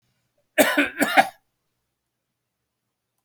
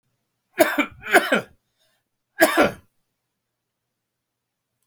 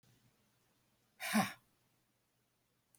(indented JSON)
{
  "cough_length": "3.2 s",
  "cough_amplitude": 27597,
  "cough_signal_mean_std_ratio": 0.3,
  "three_cough_length": "4.9 s",
  "three_cough_amplitude": 28282,
  "three_cough_signal_mean_std_ratio": 0.3,
  "exhalation_length": "3.0 s",
  "exhalation_amplitude": 3187,
  "exhalation_signal_mean_std_ratio": 0.24,
  "survey_phase": "beta (2021-08-13 to 2022-03-07)",
  "age": "65+",
  "gender": "Male",
  "wearing_mask": "No",
  "symptom_none": true,
  "smoker_status": "Never smoked",
  "respiratory_condition_asthma": false,
  "respiratory_condition_other": false,
  "recruitment_source": "REACT",
  "submission_delay": "1 day",
  "covid_test_result": "Negative",
  "covid_test_method": "RT-qPCR"
}